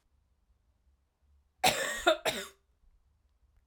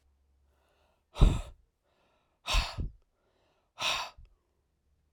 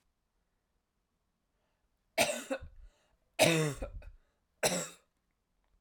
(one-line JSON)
{"cough_length": "3.7 s", "cough_amplitude": 11565, "cough_signal_mean_std_ratio": 0.3, "exhalation_length": "5.1 s", "exhalation_amplitude": 14293, "exhalation_signal_mean_std_ratio": 0.27, "three_cough_length": "5.8 s", "three_cough_amplitude": 7697, "three_cough_signal_mean_std_ratio": 0.32, "survey_phase": "alpha (2021-03-01 to 2021-08-12)", "age": "18-44", "gender": "Female", "wearing_mask": "No", "symptom_fatigue": true, "symptom_fever_high_temperature": true, "symptom_change_to_sense_of_smell_or_taste": true, "smoker_status": "Ex-smoker", "respiratory_condition_asthma": false, "respiratory_condition_other": false, "recruitment_source": "Test and Trace", "submission_delay": "2 days", "covid_test_result": "Positive", "covid_test_method": "RT-qPCR", "covid_ct_value": 21.4, "covid_ct_gene": "ORF1ab gene"}